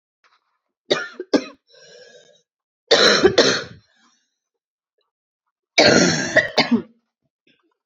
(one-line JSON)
{"three_cough_length": "7.9 s", "three_cough_amplitude": 30794, "three_cough_signal_mean_std_ratio": 0.37, "survey_phase": "beta (2021-08-13 to 2022-03-07)", "age": "18-44", "gender": "Female", "wearing_mask": "No", "symptom_cough_any": true, "symptom_runny_or_blocked_nose": true, "symptom_sore_throat": true, "symptom_fatigue": true, "symptom_fever_high_temperature": true, "symptom_headache": true, "symptom_change_to_sense_of_smell_or_taste": true, "symptom_loss_of_taste": true, "symptom_onset": "4 days", "smoker_status": "Never smoked", "respiratory_condition_asthma": true, "respiratory_condition_other": false, "recruitment_source": "Test and Trace", "submission_delay": "1 day", "covid_test_result": "Positive", "covid_test_method": "RT-qPCR", "covid_ct_value": 15.2, "covid_ct_gene": "N gene", "covid_ct_mean": 15.9, "covid_viral_load": "6300000 copies/ml", "covid_viral_load_category": "High viral load (>1M copies/ml)"}